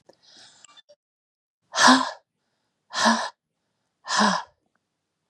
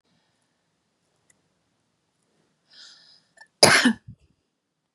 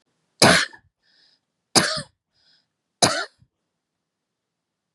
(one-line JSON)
{"exhalation_length": "5.3 s", "exhalation_amplitude": 26044, "exhalation_signal_mean_std_ratio": 0.32, "cough_length": "4.9 s", "cough_amplitude": 32768, "cough_signal_mean_std_ratio": 0.2, "three_cough_length": "4.9 s", "three_cough_amplitude": 32767, "three_cough_signal_mean_std_ratio": 0.26, "survey_phase": "beta (2021-08-13 to 2022-03-07)", "age": "45-64", "gender": "Female", "wearing_mask": "No", "symptom_fatigue": true, "symptom_onset": "12 days", "smoker_status": "Never smoked", "respiratory_condition_asthma": false, "respiratory_condition_other": false, "recruitment_source": "REACT", "submission_delay": "2 days", "covid_test_result": "Negative", "covid_test_method": "RT-qPCR", "influenza_a_test_result": "Negative", "influenza_b_test_result": "Negative"}